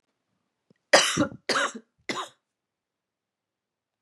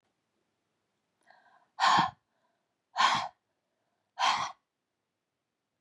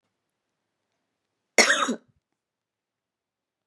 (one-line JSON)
{"three_cough_length": "4.0 s", "three_cough_amplitude": 29477, "three_cough_signal_mean_std_ratio": 0.29, "exhalation_length": "5.8 s", "exhalation_amplitude": 8173, "exhalation_signal_mean_std_ratio": 0.31, "cough_length": "3.7 s", "cough_amplitude": 25039, "cough_signal_mean_std_ratio": 0.22, "survey_phase": "beta (2021-08-13 to 2022-03-07)", "age": "45-64", "gender": "Female", "wearing_mask": "No", "symptom_cough_any": true, "symptom_runny_or_blocked_nose": true, "symptom_shortness_of_breath": true, "symptom_fatigue": true, "symptom_headache": true, "symptom_onset": "3 days", "smoker_status": "Never smoked", "respiratory_condition_asthma": false, "respiratory_condition_other": false, "recruitment_source": "Test and Trace", "submission_delay": "2 days", "covid_test_result": "Positive", "covid_test_method": "RT-qPCR", "covid_ct_value": 18.2, "covid_ct_gene": "ORF1ab gene"}